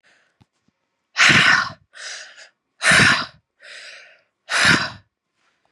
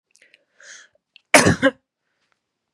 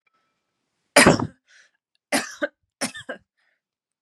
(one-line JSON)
{"exhalation_length": "5.7 s", "exhalation_amplitude": 28350, "exhalation_signal_mean_std_ratio": 0.4, "cough_length": "2.7 s", "cough_amplitude": 32768, "cough_signal_mean_std_ratio": 0.26, "three_cough_length": "4.0 s", "three_cough_amplitude": 32768, "three_cough_signal_mean_std_ratio": 0.25, "survey_phase": "beta (2021-08-13 to 2022-03-07)", "age": "18-44", "gender": "Female", "wearing_mask": "No", "symptom_cough_any": true, "symptom_runny_or_blocked_nose": true, "symptom_shortness_of_breath": true, "symptom_sore_throat": true, "symptom_fatigue": true, "symptom_headache": true, "symptom_other": true, "smoker_status": "Ex-smoker", "respiratory_condition_asthma": false, "respiratory_condition_other": false, "recruitment_source": "Test and Trace", "submission_delay": "2 days", "covid_test_result": "Positive", "covid_test_method": "RT-qPCR", "covid_ct_value": 25.6, "covid_ct_gene": "N gene"}